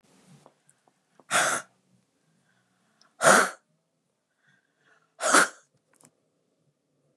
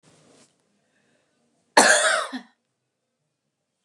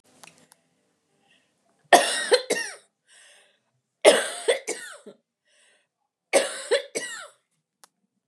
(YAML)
exhalation_length: 7.2 s
exhalation_amplitude: 21396
exhalation_signal_mean_std_ratio: 0.25
cough_length: 3.8 s
cough_amplitude: 29232
cough_signal_mean_std_ratio: 0.28
three_cough_length: 8.3 s
three_cough_amplitude: 28742
three_cough_signal_mean_std_ratio: 0.3
survey_phase: beta (2021-08-13 to 2022-03-07)
age: 45-64
gender: Female
wearing_mask: 'No'
symptom_none: true
smoker_status: Never smoked
respiratory_condition_asthma: false
respiratory_condition_other: false
recruitment_source: REACT
submission_delay: 3 days
covid_test_result: Negative
covid_test_method: RT-qPCR
influenza_a_test_result: Negative
influenza_b_test_result: Negative